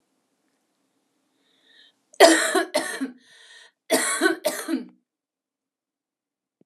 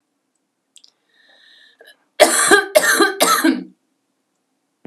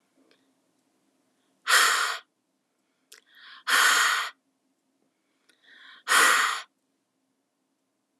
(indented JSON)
{
  "cough_length": "6.7 s",
  "cough_amplitude": 32671,
  "cough_signal_mean_std_ratio": 0.32,
  "three_cough_length": "4.9 s",
  "three_cough_amplitude": 32768,
  "three_cough_signal_mean_std_ratio": 0.39,
  "exhalation_length": "8.2 s",
  "exhalation_amplitude": 15387,
  "exhalation_signal_mean_std_ratio": 0.36,
  "survey_phase": "alpha (2021-03-01 to 2021-08-12)",
  "age": "18-44",
  "gender": "Female",
  "wearing_mask": "No",
  "symptom_cough_any": true,
  "symptom_onset": "12 days",
  "smoker_status": "Ex-smoker",
  "respiratory_condition_asthma": true,
  "respiratory_condition_other": false,
  "recruitment_source": "REACT",
  "submission_delay": "1 day",
  "covid_test_result": "Negative",
  "covid_test_method": "RT-qPCR"
}